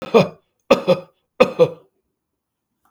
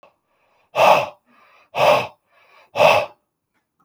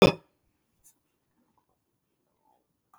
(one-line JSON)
{"three_cough_length": "2.9 s", "three_cough_amplitude": 32766, "three_cough_signal_mean_std_ratio": 0.32, "exhalation_length": "3.8 s", "exhalation_amplitude": 32646, "exhalation_signal_mean_std_ratio": 0.39, "cough_length": "3.0 s", "cough_amplitude": 18906, "cough_signal_mean_std_ratio": 0.13, "survey_phase": "beta (2021-08-13 to 2022-03-07)", "age": "65+", "gender": "Male", "wearing_mask": "No", "symptom_none": true, "smoker_status": "Ex-smoker", "respiratory_condition_asthma": false, "respiratory_condition_other": false, "recruitment_source": "REACT", "submission_delay": "1 day", "covid_test_result": "Negative", "covid_test_method": "RT-qPCR", "influenza_a_test_result": "Negative", "influenza_b_test_result": "Negative"}